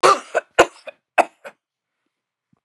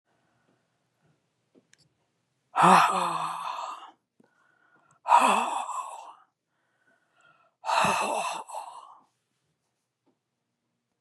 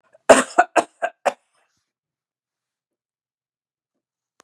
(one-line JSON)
{"three_cough_length": "2.6 s", "three_cough_amplitude": 32767, "three_cough_signal_mean_std_ratio": 0.27, "exhalation_length": "11.0 s", "exhalation_amplitude": 21260, "exhalation_signal_mean_std_ratio": 0.35, "cough_length": "4.4 s", "cough_amplitude": 32768, "cough_signal_mean_std_ratio": 0.2, "survey_phase": "beta (2021-08-13 to 2022-03-07)", "age": "65+", "gender": "Female", "wearing_mask": "No", "symptom_none": true, "smoker_status": "Ex-smoker", "respiratory_condition_asthma": false, "respiratory_condition_other": false, "recruitment_source": "Test and Trace", "submission_delay": "0 days", "covid_test_result": "Negative", "covid_test_method": "LFT"}